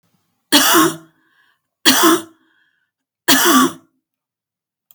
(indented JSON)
{
  "three_cough_length": "4.9 s",
  "three_cough_amplitude": 32768,
  "three_cough_signal_mean_std_ratio": 0.41,
  "survey_phase": "beta (2021-08-13 to 2022-03-07)",
  "age": "45-64",
  "gender": "Female",
  "wearing_mask": "No",
  "symptom_runny_or_blocked_nose": true,
  "symptom_fatigue": true,
  "smoker_status": "Never smoked",
  "respiratory_condition_asthma": false,
  "respiratory_condition_other": false,
  "recruitment_source": "REACT",
  "submission_delay": "1 day",
  "covid_test_result": "Negative",
  "covid_test_method": "RT-qPCR",
  "influenza_a_test_result": "Negative",
  "influenza_b_test_result": "Negative"
}